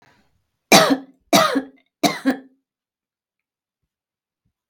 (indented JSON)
{
  "three_cough_length": "4.7 s",
  "three_cough_amplitude": 32768,
  "three_cough_signal_mean_std_ratio": 0.3,
  "survey_phase": "beta (2021-08-13 to 2022-03-07)",
  "age": "45-64",
  "gender": "Female",
  "wearing_mask": "No",
  "symptom_none": true,
  "smoker_status": "Never smoked",
  "respiratory_condition_asthma": false,
  "respiratory_condition_other": false,
  "recruitment_source": "REACT",
  "submission_delay": "3 days",
  "covid_test_result": "Negative",
  "covid_test_method": "RT-qPCR",
  "influenza_a_test_result": "Negative",
  "influenza_b_test_result": "Negative"
}